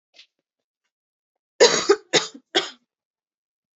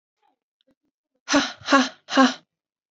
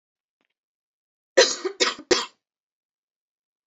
{"three_cough_length": "3.8 s", "three_cough_amplitude": 30418, "three_cough_signal_mean_std_ratio": 0.26, "exhalation_length": "2.9 s", "exhalation_amplitude": 26609, "exhalation_signal_mean_std_ratio": 0.34, "cough_length": "3.7 s", "cough_amplitude": 26803, "cough_signal_mean_std_ratio": 0.25, "survey_phase": "alpha (2021-03-01 to 2021-08-12)", "age": "18-44", "gender": "Female", "wearing_mask": "No", "symptom_cough_any": true, "symptom_new_continuous_cough": true, "symptom_fatigue": true, "symptom_headache": true, "symptom_change_to_sense_of_smell_or_taste": true, "symptom_onset": "3 days", "smoker_status": "Never smoked", "respiratory_condition_asthma": true, "respiratory_condition_other": false, "recruitment_source": "Test and Trace", "submission_delay": "1 day", "covid_test_result": "Positive", "covid_test_method": "RT-qPCR", "covid_ct_value": 14.8, "covid_ct_gene": "ORF1ab gene", "covid_ct_mean": 15.0, "covid_viral_load": "12000000 copies/ml", "covid_viral_load_category": "High viral load (>1M copies/ml)"}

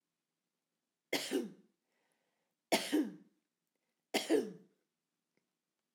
{"three_cough_length": "5.9 s", "three_cough_amplitude": 4502, "three_cough_signal_mean_std_ratio": 0.31, "survey_phase": "alpha (2021-03-01 to 2021-08-12)", "age": "65+", "gender": "Female", "wearing_mask": "No", "symptom_none": true, "smoker_status": "Ex-smoker", "respiratory_condition_asthma": false, "respiratory_condition_other": false, "recruitment_source": "REACT", "submission_delay": "4 days", "covid_test_result": "Negative", "covid_test_method": "RT-qPCR"}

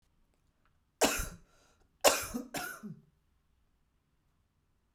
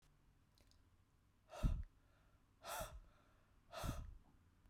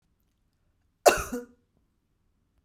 {"three_cough_length": "4.9 s", "three_cough_amplitude": 11786, "three_cough_signal_mean_std_ratio": 0.28, "exhalation_length": "4.7 s", "exhalation_amplitude": 1510, "exhalation_signal_mean_std_ratio": 0.37, "cough_length": "2.6 s", "cough_amplitude": 24689, "cough_signal_mean_std_ratio": 0.19, "survey_phase": "beta (2021-08-13 to 2022-03-07)", "age": "45-64", "gender": "Female", "wearing_mask": "No", "symptom_cough_any": true, "smoker_status": "Never smoked", "respiratory_condition_asthma": true, "respiratory_condition_other": false, "recruitment_source": "REACT", "submission_delay": "5 days", "covid_test_result": "Negative", "covid_test_method": "RT-qPCR", "influenza_a_test_result": "Negative", "influenza_b_test_result": "Negative"}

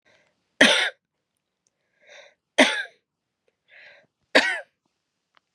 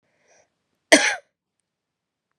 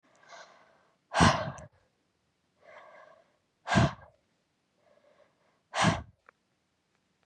{"three_cough_length": "5.5 s", "three_cough_amplitude": 31877, "three_cough_signal_mean_std_ratio": 0.26, "cough_length": "2.4 s", "cough_amplitude": 32461, "cough_signal_mean_std_ratio": 0.21, "exhalation_length": "7.3 s", "exhalation_amplitude": 11759, "exhalation_signal_mean_std_ratio": 0.27, "survey_phase": "beta (2021-08-13 to 2022-03-07)", "age": "18-44", "gender": "Female", "wearing_mask": "No", "symptom_shortness_of_breath": true, "symptom_sore_throat": true, "symptom_fatigue": true, "symptom_headache": true, "symptom_onset": "6 days", "smoker_status": "Never smoked", "respiratory_condition_asthma": false, "respiratory_condition_other": false, "recruitment_source": "REACT", "submission_delay": "2 days", "covid_test_result": "Negative", "covid_test_method": "RT-qPCR", "influenza_a_test_result": "Unknown/Void", "influenza_b_test_result": "Unknown/Void"}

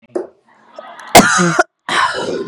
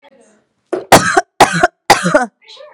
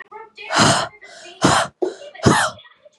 {"cough_length": "2.5 s", "cough_amplitude": 32768, "cough_signal_mean_std_ratio": 0.51, "three_cough_length": "2.7 s", "three_cough_amplitude": 32768, "three_cough_signal_mean_std_ratio": 0.44, "exhalation_length": "3.0 s", "exhalation_amplitude": 32768, "exhalation_signal_mean_std_ratio": 0.51, "survey_phase": "beta (2021-08-13 to 2022-03-07)", "age": "18-44", "gender": "Female", "wearing_mask": "No", "symptom_none": true, "smoker_status": "Current smoker (e-cigarettes or vapes only)", "respiratory_condition_asthma": false, "respiratory_condition_other": false, "recruitment_source": "REACT", "submission_delay": "5 days", "covid_test_result": "Negative", "covid_test_method": "RT-qPCR", "influenza_a_test_result": "Negative", "influenza_b_test_result": "Negative"}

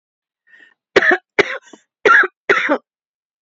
{"cough_length": "3.4 s", "cough_amplitude": 28689, "cough_signal_mean_std_ratio": 0.38, "survey_phase": "beta (2021-08-13 to 2022-03-07)", "age": "45-64", "gender": "Female", "wearing_mask": "Yes", "symptom_sore_throat": true, "smoker_status": "Never smoked", "respiratory_condition_asthma": false, "respiratory_condition_other": false, "recruitment_source": "Test and Trace", "submission_delay": "2 days", "covid_test_result": "Positive", "covid_test_method": "RT-qPCR", "covid_ct_value": 20.5, "covid_ct_gene": "ORF1ab gene", "covid_ct_mean": 20.7, "covid_viral_load": "170000 copies/ml", "covid_viral_load_category": "Low viral load (10K-1M copies/ml)"}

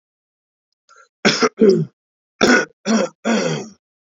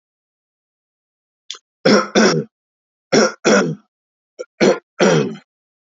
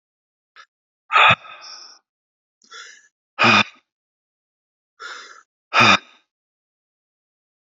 {"cough_length": "4.1 s", "cough_amplitude": 31054, "cough_signal_mean_std_ratio": 0.45, "three_cough_length": "5.8 s", "three_cough_amplitude": 30593, "three_cough_signal_mean_std_ratio": 0.41, "exhalation_length": "7.8 s", "exhalation_amplitude": 28608, "exhalation_signal_mean_std_ratio": 0.26, "survey_phase": "alpha (2021-03-01 to 2021-08-12)", "age": "45-64", "gender": "Male", "wearing_mask": "No", "symptom_none": true, "smoker_status": "Ex-smoker", "respiratory_condition_asthma": false, "respiratory_condition_other": false, "recruitment_source": "REACT", "submission_delay": "2 days", "covid_test_result": "Negative", "covid_test_method": "RT-qPCR"}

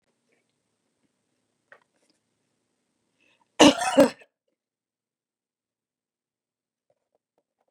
{"cough_length": "7.7 s", "cough_amplitude": 28350, "cough_signal_mean_std_ratio": 0.15, "survey_phase": "beta (2021-08-13 to 2022-03-07)", "age": "65+", "gender": "Female", "wearing_mask": "No", "symptom_none": true, "smoker_status": "Never smoked", "respiratory_condition_asthma": false, "respiratory_condition_other": false, "recruitment_source": "REACT", "submission_delay": "2 days", "covid_test_result": "Negative", "covid_test_method": "RT-qPCR", "influenza_a_test_result": "Negative", "influenza_b_test_result": "Negative"}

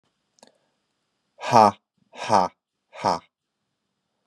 {"exhalation_length": "4.3 s", "exhalation_amplitude": 27460, "exhalation_signal_mean_std_ratio": 0.26, "survey_phase": "beta (2021-08-13 to 2022-03-07)", "age": "18-44", "gender": "Male", "wearing_mask": "No", "symptom_fatigue": true, "symptom_fever_high_temperature": true, "symptom_onset": "8 days", "smoker_status": "Never smoked", "respiratory_condition_asthma": false, "respiratory_condition_other": false, "recruitment_source": "Test and Trace", "submission_delay": "1 day", "covid_test_result": "Positive", "covid_test_method": "RT-qPCR", "covid_ct_value": 22.9, "covid_ct_gene": "N gene"}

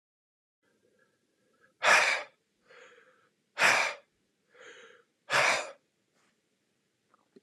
{"exhalation_length": "7.4 s", "exhalation_amplitude": 10794, "exhalation_signal_mean_std_ratio": 0.31, "survey_phase": "alpha (2021-03-01 to 2021-08-12)", "age": "45-64", "gender": "Male", "wearing_mask": "No", "symptom_none": true, "symptom_onset": "12 days", "smoker_status": "Never smoked", "respiratory_condition_asthma": false, "respiratory_condition_other": false, "recruitment_source": "REACT", "submission_delay": "1 day", "covid_test_result": "Negative", "covid_test_method": "RT-qPCR"}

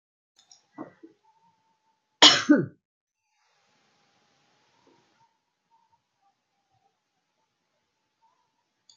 {"cough_length": "9.0 s", "cough_amplitude": 28836, "cough_signal_mean_std_ratio": 0.15, "survey_phase": "beta (2021-08-13 to 2022-03-07)", "age": "65+", "gender": "Female", "wearing_mask": "No", "symptom_none": true, "smoker_status": "Never smoked", "respiratory_condition_asthma": false, "respiratory_condition_other": false, "recruitment_source": "REACT", "submission_delay": "2 days", "covid_test_result": "Negative", "covid_test_method": "RT-qPCR"}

